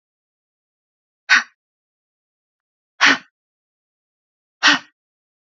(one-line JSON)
{"exhalation_length": "5.5 s", "exhalation_amplitude": 29722, "exhalation_signal_mean_std_ratio": 0.22, "survey_phase": "beta (2021-08-13 to 2022-03-07)", "age": "18-44", "gender": "Female", "wearing_mask": "No", "symptom_runny_or_blocked_nose": true, "smoker_status": "Never smoked", "respiratory_condition_asthma": false, "respiratory_condition_other": false, "recruitment_source": "Test and Trace", "submission_delay": "2 days", "covid_test_result": "Positive", "covid_test_method": "RT-qPCR", "covid_ct_value": 22.6, "covid_ct_gene": "ORF1ab gene", "covid_ct_mean": 24.0, "covid_viral_load": "13000 copies/ml", "covid_viral_load_category": "Low viral load (10K-1M copies/ml)"}